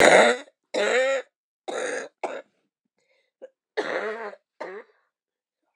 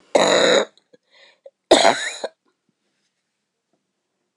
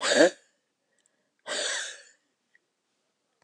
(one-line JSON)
{"cough_length": "5.8 s", "cough_amplitude": 26028, "cough_signal_mean_std_ratio": 0.39, "three_cough_length": "4.4 s", "three_cough_amplitude": 26028, "three_cough_signal_mean_std_ratio": 0.34, "exhalation_length": "3.4 s", "exhalation_amplitude": 15768, "exhalation_signal_mean_std_ratio": 0.3, "survey_phase": "beta (2021-08-13 to 2022-03-07)", "age": "65+", "gender": "Female", "wearing_mask": "No", "symptom_sore_throat": true, "smoker_status": "Never smoked", "respiratory_condition_asthma": false, "respiratory_condition_other": false, "recruitment_source": "REACT", "submission_delay": "2 days", "covid_test_result": "Negative", "covid_test_method": "RT-qPCR"}